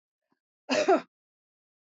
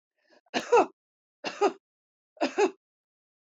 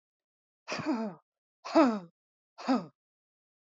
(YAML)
cough_length: 1.9 s
cough_amplitude: 8682
cough_signal_mean_std_ratio: 0.3
three_cough_length: 3.5 s
three_cough_amplitude: 9595
three_cough_signal_mean_std_ratio: 0.31
exhalation_length: 3.8 s
exhalation_amplitude: 8901
exhalation_signal_mean_std_ratio: 0.35
survey_phase: beta (2021-08-13 to 2022-03-07)
age: 65+
gender: Female
wearing_mask: 'No'
symptom_none: true
smoker_status: Never smoked
respiratory_condition_asthma: true
respiratory_condition_other: false
recruitment_source: REACT
submission_delay: 3 days
covid_test_result: Negative
covid_test_method: RT-qPCR
influenza_a_test_result: Unknown/Void
influenza_b_test_result: Unknown/Void